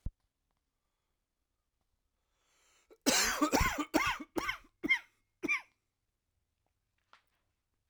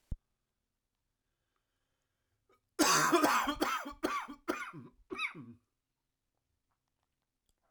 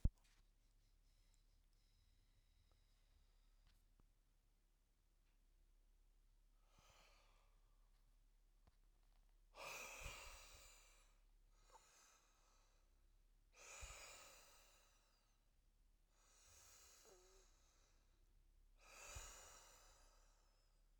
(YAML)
cough_length: 7.9 s
cough_amplitude: 7367
cough_signal_mean_std_ratio: 0.34
three_cough_length: 7.7 s
three_cough_amplitude: 6315
three_cough_signal_mean_std_ratio: 0.36
exhalation_length: 21.0 s
exhalation_amplitude: 2015
exhalation_signal_mean_std_ratio: 0.32
survey_phase: alpha (2021-03-01 to 2021-08-12)
age: 45-64
gender: Male
wearing_mask: 'No'
symptom_cough_any: true
symptom_new_continuous_cough: true
symptom_fatigue: true
symptom_fever_high_temperature: true
symptom_headache: true
symptom_change_to_sense_of_smell_or_taste: true
symptom_onset: 2 days
smoker_status: Never smoked
respiratory_condition_asthma: false
respiratory_condition_other: false
recruitment_source: Test and Trace
submission_delay: 2 days
covid_test_result: Positive
covid_test_method: RT-qPCR
covid_ct_value: 15.4
covid_ct_gene: ORF1ab gene
covid_ct_mean: 16.0
covid_viral_load: 5500000 copies/ml
covid_viral_load_category: High viral load (>1M copies/ml)